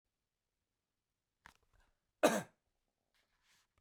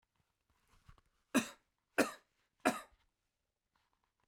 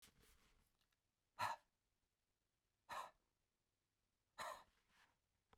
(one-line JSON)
{"cough_length": "3.8 s", "cough_amplitude": 6024, "cough_signal_mean_std_ratio": 0.16, "three_cough_length": "4.3 s", "three_cough_amplitude": 5165, "three_cough_signal_mean_std_ratio": 0.21, "exhalation_length": "5.6 s", "exhalation_amplitude": 856, "exhalation_signal_mean_std_ratio": 0.27, "survey_phase": "beta (2021-08-13 to 2022-03-07)", "age": "45-64", "gender": "Male", "wearing_mask": "No", "symptom_runny_or_blocked_nose": true, "symptom_headache": true, "smoker_status": "Never smoked", "respiratory_condition_asthma": false, "respiratory_condition_other": false, "recruitment_source": "REACT", "submission_delay": "2 days", "covid_test_result": "Negative", "covid_test_method": "RT-qPCR", "influenza_a_test_result": "Negative", "influenza_b_test_result": "Negative"}